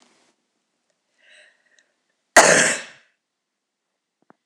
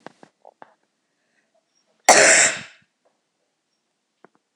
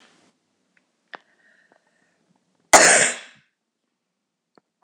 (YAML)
three_cough_length: 4.5 s
three_cough_amplitude: 26028
three_cough_signal_mean_std_ratio: 0.23
exhalation_length: 4.6 s
exhalation_amplitude: 26028
exhalation_signal_mean_std_ratio: 0.25
cough_length: 4.8 s
cough_amplitude: 26028
cough_signal_mean_std_ratio: 0.22
survey_phase: beta (2021-08-13 to 2022-03-07)
age: 65+
gender: Female
wearing_mask: 'No'
symptom_cough_any: true
symptom_runny_or_blocked_nose: true
symptom_fatigue: true
symptom_other: true
smoker_status: Never smoked
respiratory_condition_asthma: false
respiratory_condition_other: false
recruitment_source: Test and Trace
submission_delay: 2 days
covid_test_result: Negative
covid_test_method: RT-qPCR